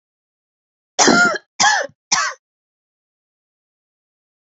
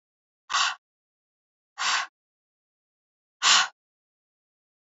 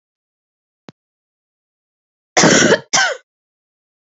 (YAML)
three_cough_length: 4.4 s
three_cough_amplitude: 30393
three_cough_signal_mean_std_ratio: 0.34
exhalation_length: 4.9 s
exhalation_amplitude: 17821
exhalation_signal_mean_std_ratio: 0.28
cough_length: 4.0 s
cough_amplitude: 30446
cough_signal_mean_std_ratio: 0.32
survey_phase: alpha (2021-03-01 to 2021-08-12)
age: 18-44
gender: Female
wearing_mask: 'No'
symptom_cough_any: true
symptom_new_continuous_cough: true
symptom_fatigue: true
symptom_headache: true
symptom_change_to_sense_of_smell_or_taste: true
symptom_onset: 4 days
smoker_status: Never smoked
respiratory_condition_asthma: false
respiratory_condition_other: false
recruitment_source: Test and Trace
submission_delay: 3 days
covid_test_result: Positive
covid_test_method: RT-qPCR
covid_ct_value: 18.0
covid_ct_gene: ORF1ab gene
covid_ct_mean: 18.4
covid_viral_load: 940000 copies/ml
covid_viral_load_category: Low viral load (10K-1M copies/ml)